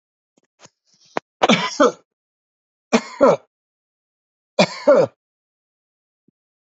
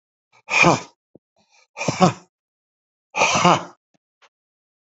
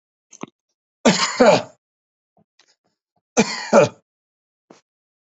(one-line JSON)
{"three_cough_length": "6.7 s", "three_cough_amplitude": 32767, "three_cough_signal_mean_std_ratio": 0.29, "exhalation_length": "4.9 s", "exhalation_amplitude": 31965, "exhalation_signal_mean_std_ratio": 0.33, "cough_length": "5.3 s", "cough_amplitude": 27880, "cough_signal_mean_std_ratio": 0.3, "survey_phase": "alpha (2021-03-01 to 2021-08-12)", "age": "65+", "gender": "Male", "wearing_mask": "No", "symptom_none": true, "smoker_status": "Ex-smoker", "respiratory_condition_asthma": false, "respiratory_condition_other": false, "recruitment_source": "REACT", "submission_delay": "2 days", "covid_test_result": "Negative", "covid_test_method": "RT-qPCR"}